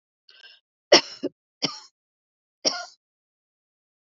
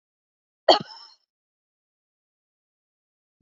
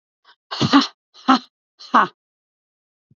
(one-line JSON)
{"three_cough_length": "4.0 s", "three_cough_amplitude": 29848, "three_cough_signal_mean_std_ratio": 0.19, "cough_length": "3.4 s", "cough_amplitude": 27290, "cough_signal_mean_std_ratio": 0.13, "exhalation_length": "3.2 s", "exhalation_amplitude": 30160, "exhalation_signal_mean_std_ratio": 0.3, "survey_phase": "beta (2021-08-13 to 2022-03-07)", "age": "65+", "gender": "Female", "wearing_mask": "No", "symptom_diarrhoea": true, "symptom_fatigue": true, "symptom_headache": true, "symptom_onset": "12 days", "smoker_status": "Never smoked", "respiratory_condition_asthma": true, "respiratory_condition_other": false, "recruitment_source": "REACT", "submission_delay": "3 days", "covid_test_result": "Negative", "covid_test_method": "RT-qPCR", "influenza_a_test_result": "Unknown/Void", "influenza_b_test_result": "Unknown/Void"}